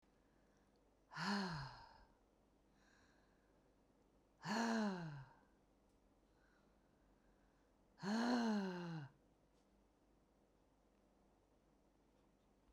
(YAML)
exhalation_length: 12.7 s
exhalation_amplitude: 1108
exhalation_signal_mean_std_ratio: 0.4
survey_phase: beta (2021-08-13 to 2022-03-07)
age: 45-64
gender: Female
wearing_mask: 'No'
symptom_none: true
smoker_status: Current smoker (11 or more cigarettes per day)
respiratory_condition_asthma: false
respiratory_condition_other: false
recruitment_source: REACT
submission_delay: 1 day
covid_test_result: Negative
covid_test_method: RT-qPCR